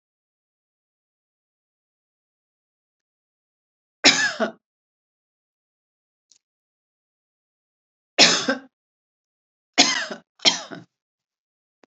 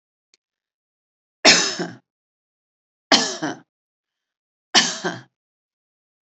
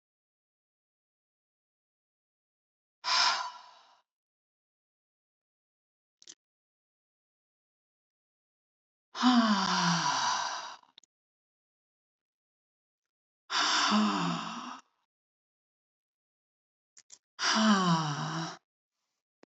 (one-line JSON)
{"cough_length": "11.9 s", "cough_amplitude": 32768, "cough_signal_mean_std_ratio": 0.22, "three_cough_length": "6.2 s", "three_cough_amplitude": 32768, "three_cough_signal_mean_std_ratio": 0.27, "exhalation_length": "19.5 s", "exhalation_amplitude": 7202, "exhalation_signal_mean_std_ratio": 0.37, "survey_phase": "alpha (2021-03-01 to 2021-08-12)", "age": "65+", "gender": "Female", "wearing_mask": "No", "symptom_none": true, "smoker_status": "Ex-smoker", "respiratory_condition_asthma": false, "respiratory_condition_other": false, "recruitment_source": "REACT", "submission_delay": "1 day", "covid_test_result": "Negative", "covid_test_method": "RT-qPCR"}